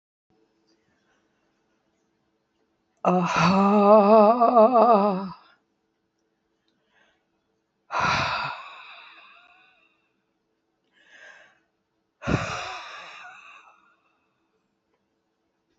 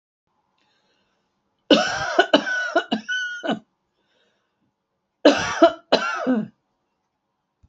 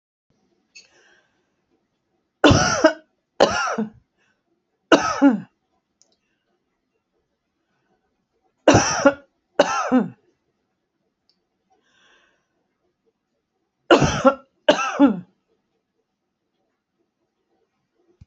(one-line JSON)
{"exhalation_length": "15.8 s", "exhalation_amplitude": 21808, "exhalation_signal_mean_std_ratio": 0.35, "cough_length": "7.7 s", "cough_amplitude": 29221, "cough_signal_mean_std_ratio": 0.38, "three_cough_length": "18.3 s", "three_cough_amplitude": 32768, "three_cough_signal_mean_std_ratio": 0.29, "survey_phase": "beta (2021-08-13 to 2022-03-07)", "age": "65+", "gender": "Female", "wearing_mask": "No", "symptom_none": true, "smoker_status": "Never smoked", "respiratory_condition_asthma": true, "respiratory_condition_other": false, "recruitment_source": "REACT", "submission_delay": "4 days", "covid_test_result": "Negative", "covid_test_method": "RT-qPCR", "influenza_a_test_result": "Negative", "influenza_b_test_result": "Negative"}